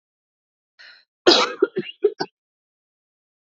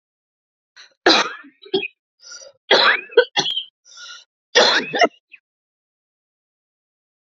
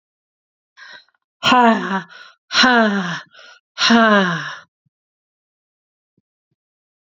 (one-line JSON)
{"cough_length": "3.6 s", "cough_amplitude": 27897, "cough_signal_mean_std_ratio": 0.26, "three_cough_length": "7.3 s", "three_cough_amplitude": 32283, "three_cough_signal_mean_std_ratio": 0.34, "exhalation_length": "7.1 s", "exhalation_amplitude": 29147, "exhalation_signal_mean_std_ratio": 0.41, "survey_phase": "beta (2021-08-13 to 2022-03-07)", "age": "45-64", "gender": "Female", "wearing_mask": "No", "symptom_cough_any": true, "symptom_runny_or_blocked_nose": true, "symptom_sore_throat": true, "symptom_fatigue": true, "symptom_fever_high_temperature": true, "symptom_loss_of_taste": true, "symptom_other": true, "symptom_onset": "2 days", "smoker_status": "Current smoker (e-cigarettes or vapes only)", "respiratory_condition_asthma": false, "respiratory_condition_other": false, "recruitment_source": "Test and Trace", "submission_delay": "1 day", "covid_test_result": "Positive", "covid_test_method": "RT-qPCR", "covid_ct_value": 17.8, "covid_ct_gene": "S gene", "covid_ct_mean": 18.1, "covid_viral_load": "1200000 copies/ml", "covid_viral_load_category": "High viral load (>1M copies/ml)"}